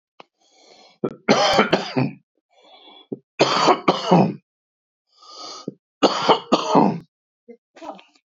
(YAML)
three_cough_length: 8.4 s
three_cough_amplitude: 27166
three_cough_signal_mean_std_ratio: 0.42
survey_phase: beta (2021-08-13 to 2022-03-07)
age: 65+
gender: Male
wearing_mask: 'No'
symptom_cough_any: true
symptom_runny_or_blocked_nose: true
symptom_sore_throat: true
symptom_headache: true
smoker_status: Ex-smoker
respiratory_condition_asthma: false
respiratory_condition_other: false
recruitment_source: REACT
submission_delay: 1 day
covid_test_result: Negative
covid_test_method: RT-qPCR